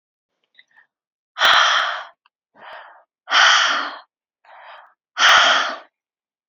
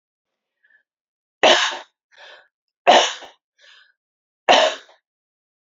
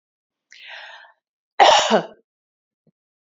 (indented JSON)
{
  "exhalation_length": "6.5 s",
  "exhalation_amplitude": 29264,
  "exhalation_signal_mean_std_ratio": 0.43,
  "three_cough_length": "5.6 s",
  "three_cough_amplitude": 28998,
  "three_cough_signal_mean_std_ratio": 0.29,
  "cough_length": "3.3 s",
  "cough_amplitude": 32526,
  "cough_signal_mean_std_ratio": 0.29,
  "survey_phase": "beta (2021-08-13 to 2022-03-07)",
  "age": "45-64",
  "gender": "Female",
  "wearing_mask": "No",
  "symptom_none": true,
  "smoker_status": "Never smoked",
  "respiratory_condition_asthma": false,
  "respiratory_condition_other": false,
  "recruitment_source": "REACT",
  "submission_delay": "2 days",
  "covid_test_result": "Negative",
  "covid_test_method": "RT-qPCR",
  "influenza_a_test_result": "Negative",
  "influenza_b_test_result": "Negative"
}